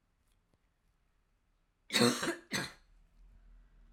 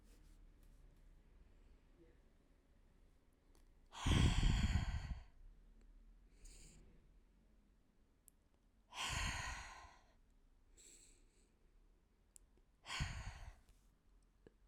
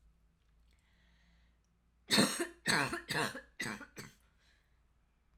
cough_length: 3.9 s
cough_amplitude: 6087
cough_signal_mean_std_ratio: 0.3
exhalation_length: 14.7 s
exhalation_amplitude: 2414
exhalation_signal_mean_std_ratio: 0.35
three_cough_length: 5.4 s
three_cough_amplitude: 5808
three_cough_signal_mean_std_ratio: 0.35
survey_phase: alpha (2021-03-01 to 2021-08-12)
age: 18-44
gender: Female
wearing_mask: 'No'
symptom_fatigue: true
symptom_fever_high_temperature: true
symptom_headache: true
symptom_change_to_sense_of_smell_or_taste: true
symptom_loss_of_taste: true
symptom_onset: 3 days
smoker_status: Current smoker (1 to 10 cigarettes per day)
respiratory_condition_asthma: false
respiratory_condition_other: false
recruitment_source: Test and Trace
submission_delay: 1 day
covid_test_result: Positive
covid_test_method: RT-qPCR
covid_ct_value: 17.1
covid_ct_gene: ORF1ab gene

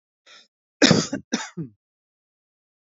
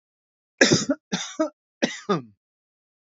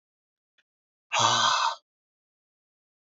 cough_length: 3.0 s
cough_amplitude: 27509
cough_signal_mean_std_ratio: 0.26
three_cough_length: 3.1 s
three_cough_amplitude: 27520
three_cough_signal_mean_std_ratio: 0.35
exhalation_length: 3.2 s
exhalation_amplitude: 11646
exhalation_signal_mean_std_ratio: 0.36
survey_phase: beta (2021-08-13 to 2022-03-07)
age: 45-64
gender: Male
wearing_mask: 'No'
symptom_none: true
smoker_status: Never smoked
respiratory_condition_asthma: false
respiratory_condition_other: false
recruitment_source: Test and Trace
submission_delay: 2 days
covid_test_result: Negative
covid_test_method: LFT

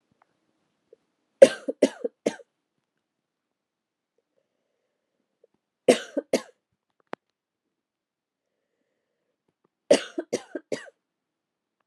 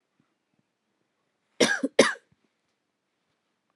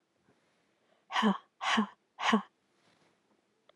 three_cough_length: 11.9 s
three_cough_amplitude: 32768
three_cough_signal_mean_std_ratio: 0.15
cough_length: 3.8 s
cough_amplitude: 22743
cough_signal_mean_std_ratio: 0.21
exhalation_length: 3.8 s
exhalation_amplitude: 6959
exhalation_signal_mean_std_ratio: 0.34
survey_phase: beta (2021-08-13 to 2022-03-07)
age: 45-64
gender: Female
wearing_mask: 'No'
symptom_cough_any: true
symptom_shortness_of_breath: true
symptom_fatigue: true
symptom_fever_high_temperature: true
symptom_headache: true
smoker_status: Never smoked
respiratory_condition_asthma: false
respiratory_condition_other: false
recruitment_source: Test and Trace
submission_delay: 1 day
covid_test_result: Positive
covid_test_method: RT-qPCR
covid_ct_value: 16.7
covid_ct_gene: ORF1ab gene
covid_ct_mean: 17.1
covid_viral_load: 2500000 copies/ml
covid_viral_load_category: High viral load (>1M copies/ml)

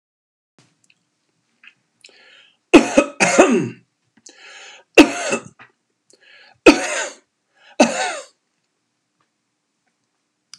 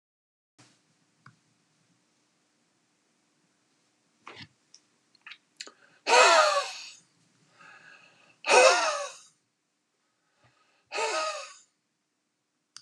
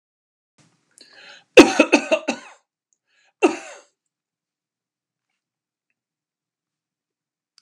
three_cough_length: 10.6 s
three_cough_amplitude: 32768
three_cough_signal_mean_std_ratio: 0.27
exhalation_length: 12.8 s
exhalation_amplitude: 18741
exhalation_signal_mean_std_ratio: 0.27
cough_length: 7.6 s
cough_amplitude: 32768
cough_signal_mean_std_ratio: 0.18
survey_phase: beta (2021-08-13 to 2022-03-07)
age: 65+
gender: Male
wearing_mask: 'No'
symptom_none: true
smoker_status: Never smoked
respiratory_condition_asthma: false
respiratory_condition_other: false
recruitment_source: REACT
submission_delay: 1 day
covid_test_result: Negative
covid_test_method: RT-qPCR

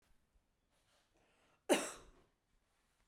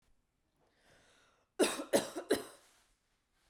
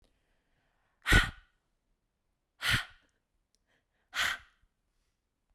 cough_length: 3.1 s
cough_amplitude: 4078
cough_signal_mean_std_ratio: 0.2
three_cough_length: 3.5 s
three_cough_amplitude: 5214
three_cough_signal_mean_std_ratio: 0.29
exhalation_length: 5.5 s
exhalation_amplitude: 12899
exhalation_signal_mean_std_ratio: 0.24
survey_phase: beta (2021-08-13 to 2022-03-07)
age: 18-44
gender: Female
wearing_mask: 'No'
symptom_none: true
smoker_status: Never smoked
respiratory_condition_asthma: false
respiratory_condition_other: false
recruitment_source: REACT
submission_delay: 2 days
covid_test_result: Negative
covid_test_method: RT-qPCR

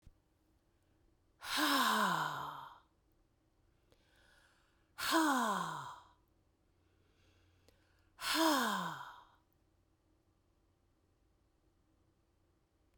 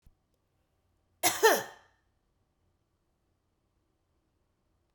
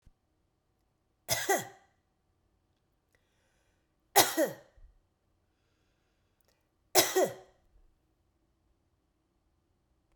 exhalation_length: 13.0 s
exhalation_amplitude: 3747
exhalation_signal_mean_std_ratio: 0.38
cough_length: 4.9 s
cough_amplitude: 11285
cough_signal_mean_std_ratio: 0.2
three_cough_length: 10.2 s
three_cough_amplitude: 15302
three_cough_signal_mean_std_ratio: 0.22
survey_phase: beta (2021-08-13 to 2022-03-07)
age: 45-64
gender: Female
wearing_mask: 'No'
symptom_none: true
smoker_status: Ex-smoker
respiratory_condition_asthma: true
respiratory_condition_other: false
recruitment_source: REACT
submission_delay: 2 days
covid_test_result: Negative
covid_test_method: RT-qPCR
influenza_a_test_result: Negative
influenza_b_test_result: Negative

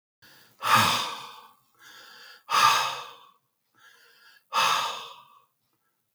exhalation_length: 6.1 s
exhalation_amplitude: 15316
exhalation_signal_mean_std_ratio: 0.41
survey_phase: beta (2021-08-13 to 2022-03-07)
age: 65+
gender: Male
wearing_mask: 'No'
symptom_cough_any: true
symptom_runny_or_blocked_nose: true
smoker_status: Ex-smoker
respiratory_condition_asthma: false
respiratory_condition_other: false
recruitment_source: Test and Trace
submission_delay: 2 days
covid_test_result: Positive
covid_test_method: LFT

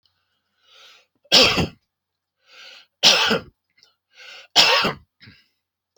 three_cough_length: 6.0 s
three_cough_amplitude: 32768
three_cough_signal_mean_std_ratio: 0.34
survey_phase: alpha (2021-03-01 to 2021-08-12)
age: 45-64
gender: Male
wearing_mask: 'No'
symptom_none: true
smoker_status: Never smoked
respiratory_condition_asthma: false
respiratory_condition_other: false
recruitment_source: REACT
submission_delay: 1 day
covid_test_result: Negative
covid_test_method: RT-qPCR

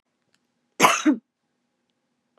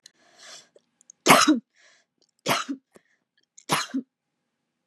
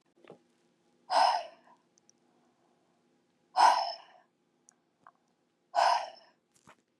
cough_length: 2.4 s
cough_amplitude: 26818
cough_signal_mean_std_ratio: 0.28
three_cough_length: 4.9 s
three_cough_amplitude: 31756
three_cough_signal_mean_std_ratio: 0.28
exhalation_length: 7.0 s
exhalation_amplitude: 10169
exhalation_signal_mean_std_ratio: 0.3
survey_phase: beta (2021-08-13 to 2022-03-07)
age: 18-44
gender: Female
wearing_mask: 'No'
symptom_cough_any: true
symptom_runny_or_blocked_nose: true
symptom_onset: 5 days
smoker_status: Ex-smoker
respiratory_condition_asthma: false
respiratory_condition_other: false
recruitment_source: REACT
submission_delay: 1 day
covid_test_result: Negative
covid_test_method: RT-qPCR
influenza_a_test_result: Negative
influenza_b_test_result: Negative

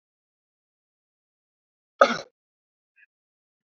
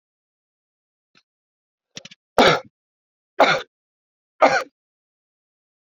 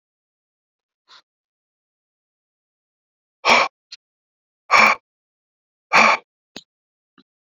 cough_length: 3.7 s
cough_amplitude: 30447
cough_signal_mean_std_ratio: 0.13
three_cough_length: 5.9 s
three_cough_amplitude: 27821
three_cough_signal_mean_std_ratio: 0.24
exhalation_length: 7.5 s
exhalation_amplitude: 28797
exhalation_signal_mean_std_ratio: 0.24
survey_phase: beta (2021-08-13 to 2022-03-07)
age: 45-64
gender: Male
wearing_mask: 'No'
symptom_cough_any: true
symptom_runny_or_blocked_nose: true
symptom_sore_throat: true
symptom_fever_high_temperature: true
smoker_status: Current smoker (1 to 10 cigarettes per day)
respiratory_condition_asthma: false
respiratory_condition_other: false
recruitment_source: Test and Trace
submission_delay: 1 day
covid_test_result: Positive
covid_test_method: RT-qPCR
covid_ct_value: 18.7
covid_ct_gene: ORF1ab gene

